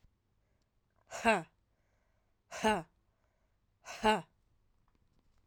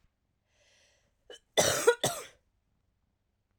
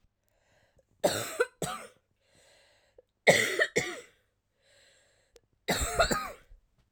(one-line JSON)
{"exhalation_length": "5.5 s", "exhalation_amplitude": 6004, "exhalation_signal_mean_std_ratio": 0.27, "cough_length": "3.6 s", "cough_amplitude": 11660, "cough_signal_mean_std_ratio": 0.27, "three_cough_length": "6.9 s", "three_cough_amplitude": 14757, "three_cough_signal_mean_std_ratio": 0.35, "survey_phase": "alpha (2021-03-01 to 2021-08-12)", "age": "18-44", "gender": "Female", "wearing_mask": "No", "symptom_cough_any": true, "symptom_headache": true, "symptom_onset": "2 days", "smoker_status": "Ex-smoker", "respiratory_condition_asthma": false, "respiratory_condition_other": false, "recruitment_source": "Test and Trace", "submission_delay": "1 day", "covid_test_result": "Positive", "covid_test_method": "RT-qPCR", "covid_ct_value": 19.6, "covid_ct_gene": "N gene"}